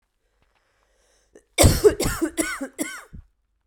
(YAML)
cough_length: 3.7 s
cough_amplitude: 30468
cough_signal_mean_std_ratio: 0.35
survey_phase: beta (2021-08-13 to 2022-03-07)
age: 18-44
gender: Female
wearing_mask: 'No'
symptom_cough_any: true
symptom_new_continuous_cough: true
symptom_runny_or_blocked_nose: true
symptom_fatigue: true
symptom_fever_high_temperature: true
symptom_headache: true
symptom_change_to_sense_of_smell_or_taste: true
symptom_loss_of_taste: true
symptom_onset: 6 days
smoker_status: Never smoked
respiratory_condition_asthma: false
respiratory_condition_other: false
recruitment_source: Test and Trace
submission_delay: 2 days
covid_test_result: Positive
covid_test_method: RT-qPCR
covid_ct_value: 17.3
covid_ct_gene: ORF1ab gene
covid_ct_mean: 17.6
covid_viral_load: 1600000 copies/ml
covid_viral_load_category: High viral load (>1M copies/ml)